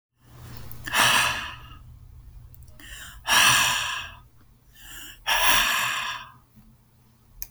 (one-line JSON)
{"exhalation_length": "7.5 s", "exhalation_amplitude": 20195, "exhalation_signal_mean_std_ratio": 0.5, "survey_phase": "beta (2021-08-13 to 2022-03-07)", "age": "45-64", "gender": "Female", "wearing_mask": "No", "symptom_none": true, "smoker_status": "Never smoked", "respiratory_condition_asthma": true, "respiratory_condition_other": false, "recruitment_source": "REACT", "submission_delay": "4 days", "covid_test_result": "Negative", "covid_test_method": "RT-qPCR"}